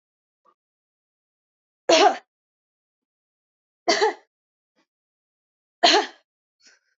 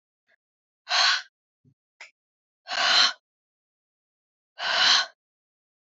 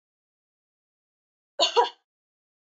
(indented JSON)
{
  "three_cough_length": "7.0 s",
  "three_cough_amplitude": 25662,
  "three_cough_signal_mean_std_ratio": 0.25,
  "exhalation_length": "6.0 s",
  "exhalation_amplitude": 16625,
  "exhalation_signal_mean_std_ratio": 0.35,
  "cough_length": "2.6 s",
  "cough_amplitude": 14018,
  "cough_signal_mean_std_ratio": 0.23,
  "survey_phase": "beta (2021-08-13 to 2022-03-07)",
  "age": "18-44",
  "gender": "Female",
  "wearing_mask": "No",
  "symptom_runny_or_blocked_nose": true,
  "symptom_shortness_of_breath": true,
  "symptom_sore_throat": true,
  "symptom_fatigue": true,
  "symptom_headache": true,
  "symptom_other": true,
  "smoker_status": "Ex-smoker",
  "respiratory_condition_asthma": false,
  "respiratory_condition_other": false,
  "recruitment_source": "Test and Trace",
  "submission_delay": "2 days",
  "covid_test_result": "Positive",
  "covid_test_method": "RT-qPCR",
  "covid_ct_value": 22.8,
  "covid_ct_gene": "N gene"
}